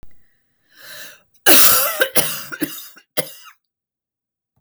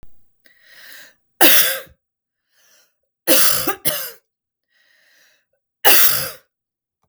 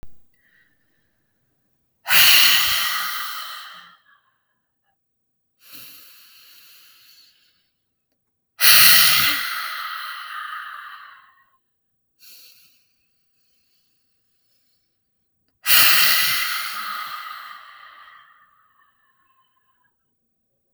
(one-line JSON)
{"cough_length": "4.6 s", "cough_amplitude": 32768, "cough_signal_mean_std_ratio": 0.36, "three_cough_length": "7.1 s", "three_cough_amplitude": 32768, "three_cough_signal_mean_std_ratio": 0.36, "exhalation_length": "20.7 s", "exhalation_amplitude": 32768, "exhalation_signal_mean_std_ratio": 0.34, "survey_phase": "beta (2021-08-13 to 2022-03-07)", "age": "45-64", "gender": "Female", "wearing_mask": "No", "symptom_none": true, "smoker_status": "Ex-smoker", "respiratory_condition_asthma": false, "respiratory_condition_other": false, "recruitment_source": "REACT", "submission_delay": "2 days", "covid_test_result": "Negative", "covid_test_method": "RT-qPCR", "influenza_a_test_result": "Negative", "influenza_b_test_result": "Negative"}